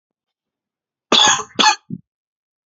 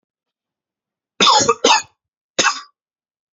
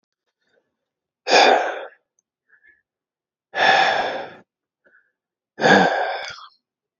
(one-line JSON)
{"cough_length": "2.7 s", "cough_amplitude": 30387, "cough_signal_mean_std_ratio": 0.33, "three_cough_length": "3.3 s", "three_cough_amplitude": 31530, "three_cough_signal_mean_std_ratio": 0.36, "exhalation_length": "7.0 s", "exhalation_amplitude": 26988, "exhalation_signal_mean_std_ratio": 0.39, "survey_phase": "alpha (2021-03-01 to 2021-08-12)", "age": "18-44", "gender": "Male", "wearing_mask": "No", "symptom_cough_any": true, "symptom_new_continuous_cough": true, "symptom_fatigue": true, "symptom_fever_high_temperature": true, "symptom_headache": true, "symptom_onset": "3 days", "smoker_status": "Never smoked", "respiratory_condition_asthma": false, "respiratory_condition_other": false, "recruitment_source": "Test and Trace", "submission_delay": "1 day", "covid_test_result": "Positive", "covid_test_method": "RT-qPCR", "covid_ct_value": 24.6, "covid_ct_gene": "ORF1ab gene", "covid_ct_mean": 25.2, "covid_viral_load": "5400 copies/ml", "covid_viral_load_category": "Minimal viral load (< 10K copies/ml)"}